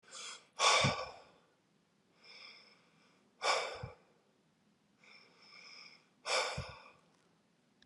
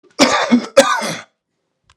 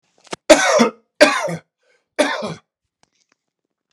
{"exhalation_length": "7.9 s", "exhalation_amplitude": 5029, "exhalation_signal_mean_std_ratio": 0.34, "cough_length": "2.0 s", "cough_amplitude": 32768, "cough_signal_mean_std_ratio": 0.48, "three_cough_length": "3.9 s", "three_cough_amplitude": 32768, "three_cough_signal_mean_std_ratio": 0.36, "survey_phase": "alpha (2021-03-01 to 2021-08-12)", "age": "45-64", "gender": "Male", "wearing_mask": "No", "symptom_fatigue": true, "symptom_headache": true, "smoker_status": "Ex-smoker", "respiratory_condition_asthma": false, "respiratory_condition_other": false, "recruitment_source": "Test and Trace", "submission_delay": "2 days", "covid_test_result": "Positive", "covid_test_method": "RT-qPCR", "covid_ct_value": 25.9, "covid_ct_gene": "ORF1ab gene", "covid_ct_mean": 26.6, "covid_viral_load": "1900 copies/ml", "covid_viral_load_category": "Minimal viral load (< 10K copies/ml)"}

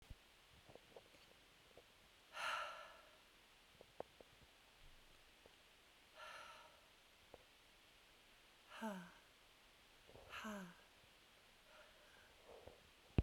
{"exhalation_length": "13.2 s", "exhalation_amplitude": 3037, "exhalation_signal_mean_std_ratio": 0.38, "survey_phase": "beta (2021-08-13 to 2022-03-07)", "age": "45-64", "gender": "Female", "wearing_mask": "Yes", "symptom_cough_any": true, "symptom_new_continuous_cough": true, "symptom_shortness_of_breath": true, "symptom_abdominal_pain": true, "symptom_fatigue": true, "symptom_fever_high_temperature": true, "symptom_headache": true, "symptom_change_to_sense_of_smell_or_taste": true, "symptom_onset": "2 days", "smoker_status": "Ex-smoker", "respiratory_condition_asthma": false, "respiratory_condition_other": false, "recruitment_source": "Test and Trace", "submission_delay": "2 days", "covid_test_result": "Positive", "covid_test_method": "RT-qPCR", "covid_ct_value": 26.3, "covid_ct_gene": "ORF1ab gene", "covid_ct_mean": 26.7, "covid_viral_load": "1700 copies/ml", "covid_viral_load_category": "Minimal viral load (< 10K copies/ml)"}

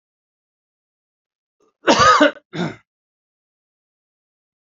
{"cough_length": "4.6 s", "cough_amplitude": 31464, "cough_signal_mean_std_ratio": 0.27, "survey_phase": "alpha (2021-03-01 to 2021-08-12)", "age": "45-64", "gender": "Male", "wearing_mask": "No", "symptom_none": true, "smoker_status": "Never smoked", "respiratory_condition_asthma": false, "respiratory_condition_other": false, "recruitment_source": "REACT", "submission_delay": "1 day", "covid_test_result": "Negative", "covid_test_method": "RT-qPCR"}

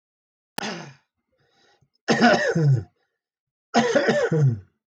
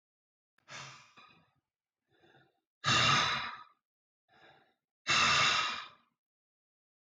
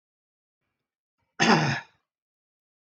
{"three_cough_length": "4.9 s", "three_cough_amplitude": 16376, "three_cough_signal_mean_std_ratio": 0.51, "exhalation_length": "7.1 s", "exhalation_amplitude": 5791, "exhalation_signal_mean_std_ratio": 0.37, "cough_length": "3.0 s", "cough_amplitude": 14196, "cough_signal_mean_std_ratio": 0.28, "survey_phase": "beta (2021-08-13 to 2022-03-07)", "age": "45-64", "gender": "Male", "wearing_mask": "No", "symptom_cough_any": true, "symptom_runny_or_blocked_nose": true, "symptom_sore_throat": true, "symptom_headache": true, "smoker_status": "Never smoked", "respiratory_condition_asthma": false, "respiratory_condition_other": false, "recruitment_source": "Test and Trace", "submission_delay": "1 day", "covid_test_result": "Positive", "covid_test_method": "RT-qPCR", "covid_ct_value": 20.3, "covid_ct_gene": "ORF1ab gene"}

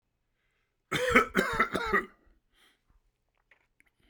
{"cough_length": "4.1 s", "cough_amplitude": 14812, "cough_signal_mean_std_ratio": 0.36, "survey_phase": "beta (2021-08-13 to 2022-03-07)", "age": "65+", "gender": "Male", "wearing_mask": "No", "symptom_none": true, "smoker_status": "Never smoked", "respiratory_condition_asthma": false, "respiratory_condition_other": false, "recruitment_source": "REACT", "submission_delay": "5 days", "covid_test_result": "Negative", "covid_test_method": "RT-qPCR"}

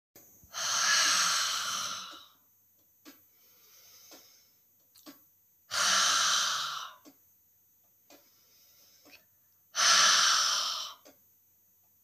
{"exhalation_length": "12.0 s", "exhalation_amplitude": 9712, "exhalation_signal_mean_std_ratio": 0.46, "survey_phase": "beta (2021-08-13 to 2022-03-07)", "age": "65+", "gender": "Female", "wearing_mask": "No", "symptom_none": true, "smoker_status": "Never smoked", "respiratory_condition_asthma": false, "respiratory_condition_other": false, "recruitment_source": "REACT", "submission_delay": "4 days", "covid_test_result": "Negative", "covid_test_method": "RT-qPCR"}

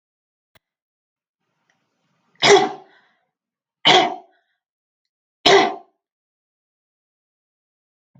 {"three_cough_length": "8.2 s", "three_cough_amplitude": 30513, "three_cough_signal_mean_std_ratio": 0.24, "survey_phase": "alpha (2021-03-01 to 2021-08-12)", "age": "65+", "gender": "Female", "wearing_mask": "No", "symptom_none": true, "smoker_status": "Never smoked", "respiratory_condition_asthma": false, "respiratory_condition_other": false, "recruitment_source": "REACT", "submission_delay": "2 days", "covid_test_result": "Negative", "covid_test_method": "RT-qPCR"}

